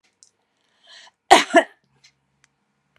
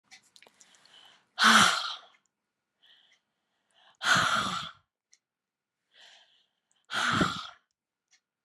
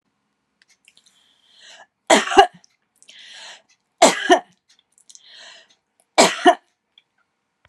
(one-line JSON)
{"cough_length": "3.0 s", "cough_amplitude": 32768, "cough_signal_mean_std_ratio": 0.21, "exhalation_length": "8.4 s", "exhalation_amplitude": 13362, "exhalation_signal_mean_std_ratio": 0.33, "three_cough_length": "7.7 s", "three_cough_amplitude": 32768, "three_cough_signal_mean_std_ratio": 0.26, "survey_phase": "beta (2021-08-13 to 2022-03-07)", "age": "45-64", "gender": "Female", "wearing_mask": "No", "symptom_none": true, "smoker_status": "Never smoked", "respiratory_condition_asthma": false, "respiratory_condition_other": false, "recruitment_source": "REACT", "submission_delay": "4 days", "covid_test_result": "Negative", "covid_test_method": "RT-qPCR"}